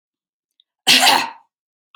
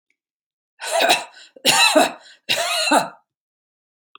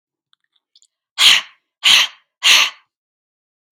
cough_length: 2.0 s
cough_amplitude: 31470
cough_signal_mean_std_ratio: 0.36
three_cough_length: 4.2 s
three_cough_amplitude: 29684
three_cough_signal_mean_std_ratio: 0.47
exhalation_length: 3.7 s
exhalation_amplitude: 32664
exhalation_signal_mean_std_ratio: 0.35
survey_phase: alpha (2021-03-01 to 2021-08-12)
age: 65+
gender: Female
wearing_mask: 'No'
symptom_none: true
smoker_status: Ex-smoker
respiratory_condition_asthma: true
respiratory_condition_other: false
recruitment_source: REACT
submission_delay: 1 day
covid_test_result: Negative
covid_test_method: RT-qPCR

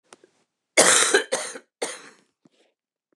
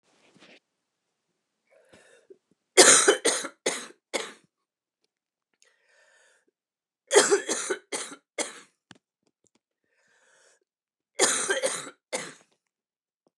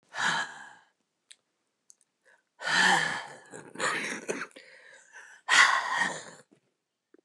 cough_length: 3.2 s
cough_amplitude: 27826
cough_signal_mean_std_ratio: 0.35
three_cough_length: 13.4 s
three_cough_amplitude: 27269
three_cough_signal_mean_std_ratio: 0.27
exhalation_length: 7.2 s
exhalation_amplitude: 15275
exhalation_signal_mean_std_ratio: 0.42
survey_phase: beta (2021-08-13 to 2022-03-07)
age: 65+
gender: Female
wearing_mask: 'No'
symptom_cough_any: true
symptom_runny_or_blocked_nose: true
symptom_sore_throat: true
symptom_fatigue: true
symptom_fever_high_temperature: true
symptom_onset: 3 days
smoker_status: Never smoked
respiratory_condition_asthma: true
respiratory_condition_other: false
recruitment_source: Test and Trace
submission_delay: 1 day
covid_test_result: Negative
covid_test_method: RT-qPCR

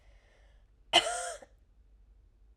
cough_length: 2.6 s
cough_amplitude: 11297
cough_signal_mean_std_ratio: 0.28
survey_phase: alpha (2021-03-01 to 2021-08-12)
age: 18-44
gender: Female
wearing_mask: 'No'
symptom_none: true
smoker_status: Never smoked
respiratory_condition_asthma: false
respiratory_condition_other: false
recruitment_source: REACT
submission_delay: 1 day
covid_test_result: Negative
covid_test_method: RT-qPCR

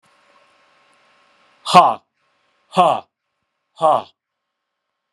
exhalation_length: 5.1 s
exhalation_amplitude: 32768
exhalation_signal_mean_std_ratio: 0.27
survey_phase: beta (2021-08-13 to 2022-03-07)
age: 45-64
gender: Male
wearing_mask: 'No'
symptom_none: true
smoker_status: Never smoked
respiratory_condition_asthma: false
respiratory_condition_other: false
recruitment_source: REACT
submission_delay: 5 days
covid_test_result: Negative
covid_test_method: RT-qPCR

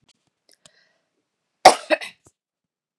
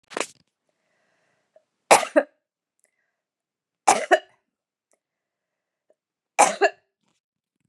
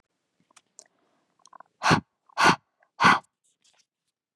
cough_length: 3.0 s
cough_amplitude: 32768
cough_signal_mean_std_ratio: 0.16
three_cough_length: 7.7 s
three_cough_amplitude: 31708
three_cough_signal_mean_std_ratio: 0.21
exhalation_length: 4.4 s
exhalation_amplitude: 18051
exhalation_signal_mean_std_ratio: 0.27
survey_phase: beta (2021-08-13 to 2022-03-07)
age: 18-44
gender: Female
wearing_mask: 'No'
symptom_none: true
smoker_status: Never smoked
respiratory_condition_asthma: false
respiratory_condition_other: false
recruitment_source: REACT
submission_delay: 1 day
covid_test_result: Negative
covid_test_method: RT-qPCR
influenza_a_test_result: Negative
influenza_b_test_result: Negative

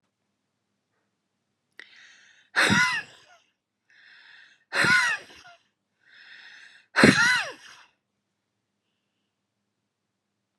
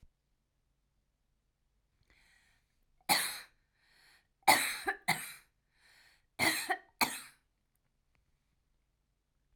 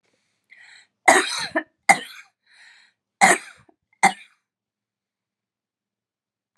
exhalation_length: 10.6 s
exhalation_amplitude: 29852
exhalation_signal_mean_std_ratio: 0.29
three_cough_length: 9.6 s
three_cough_amplitude: 10364
three_cough_signal_mean_std_ratio: 0.27
cough_length: 6.6 s
cough_amplitude: 32720
cough_signal_mean_std_ratio: 0.24
survey_phase: alpha (2021-03-01 to 2021-08-12)
age: 45-64
gender: Female
wearing_mask: 'No'
symptom_none: true
smoker_status: Ex-smoker
respiratory_condition_asthma: false
respiratory_condition_other: false
recruitment_source: REACT
submission_delay: 2 days
covid_test_result: Negative
covid_test_method: RT-qPCR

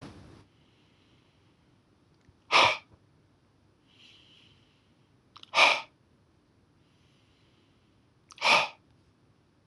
exhalation_length: 9.7 s
exhalation_amplitude: 19787
exhalation_signal_mean_std_ratio: 0.23
survey_phase: beta (2021-08-13 to 2022-03-07)
age: 45-64
gender: Male
wearing_mask: 'No'
symptom_cough_any: true
symptom_runny_or_blocked_nose: true
symptom_fatigue: true
symptom_headache: true
smoker_status: Ex-smoker
respiratory_condition_asthma: false
respiratory_condition_other: false
recruitment_source: Test and Trace
submission_delay: 1 day
covid_test_result: Positive
covid_test_method: RT-qPCR
covid_ct_value: 23.0
covid_ct_gene: ORF1ab gene
covid_ct_mean: 23.6
covid_viral_load: 18000 copies/ml
covid_viral_load_category: Low viral load (10K-1M copies/ml)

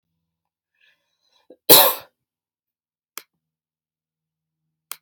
cough_length: 5.0 s
cough_amplitude: 32768
cough_signal_mean_std_ratio: 0.17
survey_phase: alpha (2021-03-01 to 2021-08-12)
age: 18-44
gender: Female
wearing_mask: 'No'
symptom_none: true
smoker_status: Never smoked
respiratory_condition_asthma: false
respiratory_condition_other: false
recruitment_source: REACT
submission_delay: 2 days
covid_test_result: Negative
covid_test_method: RT-qPCR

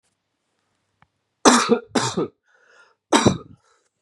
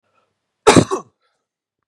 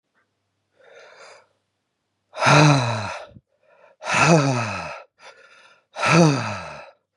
three_cough_length: 4.0 s
three_cough_amplitude: 32768
three_cough_signal_mean_std_ratio: 0.33
cough_length: 1.9 s
cough_amplitude: 32768
cough_signal_mean_std_ratio: 0.26
exhalation_length: 7.2 s
exhalation_amplitude: 30014
exhalation_signal_mean_std_ratio: 0.42
survey_phase: beta (2021-08-13 to 2022-03-07)
age: 18-44
gender: Male
wearing_mask: 'No'
symptom_none: true
smoker_status: Ex-smoker
respiratory_condition_asthma: false
respiratory_condition_other: false
recruitment_source: REACT
submission_delay: 2 days
covid_test_result: Negative
covid_test_method: RT-qPCR
influenza_a_test_result: Negative
influenza_b_test_result: Negative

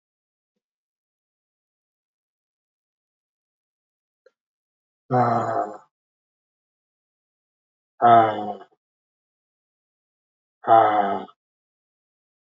exhalation_length: 12.5 s
exhalation_amplitude: 25620
exhalation_signal_mean_std_ratio: 0.26
survey_phase: alpha (2021-03-01 to 2021-08-12)
age: 45-64
gender: Male
wearing_mask: 'Yes'
symptom_cough_any: true
symptom_fever_high_temperature: true
symptom_headache: true
symptom_change_to_sense_of_smell_or_taste: true
symptom_loss_of_taste: true
symptom_onset: 3 days
smoker_status: Never smoked
respiratory_condition_asthma: false
respiratory_condition_other: false
recruitment_source: Test and Trace
submission_delay: 2 days
covid_test_result: Positive
covid_test_method: RT-qPCR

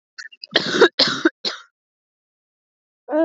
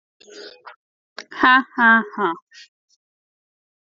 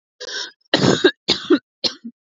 cough_length: 3.2 s
cough_amplitude: 28989
cough_signal_mean_std_ratio: 0.36
exhalation_length: 3.8 s
exhalation_amplitude: 28224
exhalation_signal_mean_std_ratio: 0.32
three_cough_length: 2.2 s
three_cough_amplitude: 31471
three_cough_signal_mean_std_ratio: 0.44
survey_phase: beta (2021-08-13 to 2022-03-07)
age: 18-44
gender: Female
wearing_mask: 'No'
symptom_cough_any: true
symptom_runny_or_blocked_nose: true
symptom_shortness_of_breath: true
symptom_sore_throat: true
symptom_fatigue: true
symptom_fever_high_temperature: true
symptom_headache: true
symptom_onset: 3 days
smoker_status: Never smoked
respiratory_condition_asthma: true
respiratory_condition_other: false
recruitment_source: Test and Trace
submission_delay: 3 days
covid_test_result: Positive
covid_test_method: RT-qPCR
covid_ct_value: 16.2
covid_ct_gene: ORF1ab gene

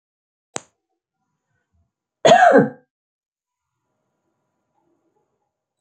cough_length: 5.8 s
cough_amplitude: 27627
cough_signal_mean_std_ratio: 0.22
survey_phase: beta (2021-08-13 to 2022-03-07)
age: 45-64
gender: Female
wearing_mask: 'No'
symptom_fatigue: true
smoker_status: Never smoked
respiratory_condition_asthma: false
respiratory_condition_other: false
recruitment_source: REACT
submission_delay: 2 days
covid_test_result: Negative
covid_test_method: RT-qPCR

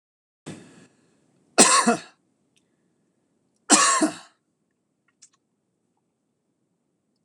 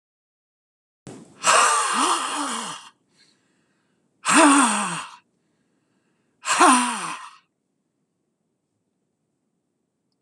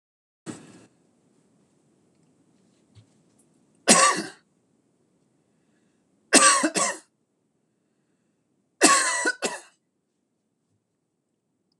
cough_length: 7.2 s
cough_amplitude: 26028
cough_signal_mean_std_ratio: 0.26
exhalation_length: 10.2 s
exhalation_amplitude: 24779
exhalation_signal_mean_std_ratio: 0.38
three_cough_length: 11.8 s
three_cough_amplitude: 25964
three_cough_signal_mean_std_ratio: 0.27
survey_phase: alpha (2021-03-01 to 2021-08-12)
age: 65+
gender: Male
wearing_mask: 'No'
symptom_none: true
smoker_status: Ex-smoker
respiratory_condition_asthma: false
respiratory_condition_other: false
recruitment_source: REACT
submission_delay: 1 day
covid_test_result: Negative
covid_test_method: RT-qPCR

